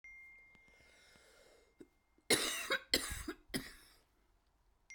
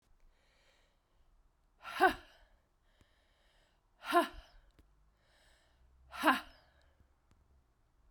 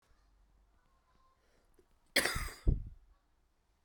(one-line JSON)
{"three_cough_length": "4.9 s", "three_cough_amplitude": 5652, "three_cough_signal_mean_std_ratio": 0.34, "exhalation_length": "8.1 s", "exhalation_amplitude": 7122, "exhalation_signal_mean_std_ratio": 0.23, "cough_length": "3.8 s", "cough_amplitude": 5987, "cough_signal_mean_std_ratio": 0.27, "survey_phase": "beta (2021-08-13 to 2022-03-07)", "age": "18-44", "gender": "Female", "wearing_mask": "No", "symptom_cough_any": true, "symptom_change_to_sense_of_smell_or_taste": true, "smoker_status": "Never smoked", "respiratory_condition_asthma": true, "respiratory_condition_other": false, "recruitment_source": "Test and Trace", "submission_delay": "1 day", "covid_test_result": "Positive", "covid_test_method": "RT-qPCR", "covid_ct_value": 16.4, "covid_ct_gene": "ORF1ab gene", "covid_ct_mean": 16.7, "covid_viral_load": "3400000 copies/ml", "covid_viral_load_category": "High viral load (>1M copies/ml)"}